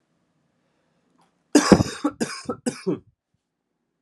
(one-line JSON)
{"cough_length": "4.0 s", "cough_amplitude": 32768, "cough_signal_mean_std_ratio": 0.27, "survey_phase": "alpha (2021-03-01 to 2021-08-12)", "age": "18-44", "gender": "Male", "wearing_mask": "No", "symptom_cough_any": true, "symptom_new_continuous_cough": true, "symptom_fever_high_temperature": true, "symptom_headache": true, "symptom_change_to_sense_of_smell_or_taste": true, "symptom_loss_of_taste": true, "smoker_status": "Never smoked", "respiratory_condition_asthma": false, "respiratory_condition_other": false, "recruitment_source": "Test and Trace", "submission_delay": "1 day", "covid_test_result": "Positive", "covid_test_method": "RT-qPCR"}